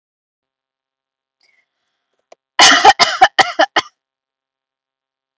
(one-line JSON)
{"cough_length": "5.4 s", "cough_amplitude": 32768, "cough_signal_mean_std_ratio": 0.28, "survey_phase": "beta (2021-08-13 to 2022-03-07)", "age": "18-44", "gender": "Female", "wearing_mask": "No", "symptom_none": true, "smoker_status": "Never smoked", "respiratory_condition_asthma": false, "respiratory_condition_other": false, "recruitment_source": "REACT", "submission_delay": "1 day", "covid_test_result": "Negative", "covid_test_method": "RT-qPCR"}